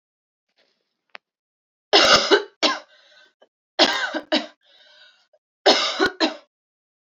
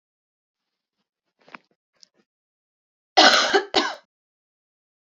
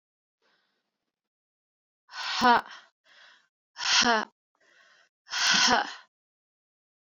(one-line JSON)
{"three_cough_length": "7.2 s", "three_cough_amplitude": 30650, "three_cough_signal_mean_std_ratio": 0.35, "cough_length": "5.0 s", "cough_amplitude": 28336, "cough_signal_mean_std_ratio": 0.25, "exhalation_length": "7.2 s", "exhalation_amplitude": 14061, "exhalation_signal_mean_std_ratio": 0.33, "survey_phase": "beta (2021-08-13 to 2022-03-07)", "age": "18-44", "gender": "Female", "wearing_mask": "No", "symptom_cough_any": true, "symptom_new_continuous_cough": true, "symptom_runny_or_blocked_nose": true, "symptom_shortness_of_breath": true, "symptom_diarrhoea": true, "symptom_fatigue": true, "symptom_headache": true, "symptom_other": true, "symptom_onset": "1 day", "smoker_status": "Never smoked", "respiratory_condition_asthma": false, "respiratory_condition_other": false, "recruitment_source": "Test and Trace", "submission_delay": "1 day", "covid_test_result": "Positive", "covid_test_method": "RT-qPCR", "covid_ct_value": 18.1, "covid_ct_gene": "ORF1ab gene", "covid_ct_mean": 18.3, "covid_viral_load": "1000000 copies/ml", "covid_viral_load_category": "High viral load (>1M copies/ml)"}